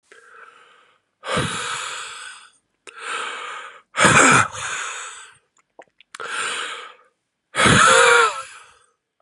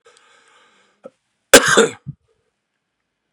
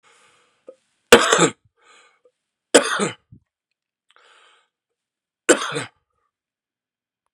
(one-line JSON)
{"exhalation_length": "9.2 s", "exhalation_amplitude": 32216, "exhalation_signal_mean_std_ratio": 0.44, "cough_length": "3.3 s", "cough_amplitude": 32768, "cough_signal_mean_std_ratio": 0.23, "three_cough_length": "7.3 s", "three_cough_amplitude": 32768, "three_cough_signal_mean_std_ratio": 0.23, "survey_phase": "beta (2021-08-13 to 2022-03-07)", "age": "18-44", "gender": "Male", "wearing_mask": "No", "symptom_cough_any": true, "symptom_runny_or_blocked_nose": true, "symptom_sore_throat": true, "symptom_abdominal_pain": true, "symptom_fatigue": true, "symptom_fever_high_temperature": true, "symptom_headache": true, "symptom_loss_of_taste": true, "symptom_onset": "4 days", "smoker_status": "Never smoked", "respiratory_condition_asthma": false, "respiratory_condition_other": false, "recruitment_source": "Test and Trace", "submission_delay": "1 day", "covid_test_result": "Positive", "covid_test_method": "ePCR"}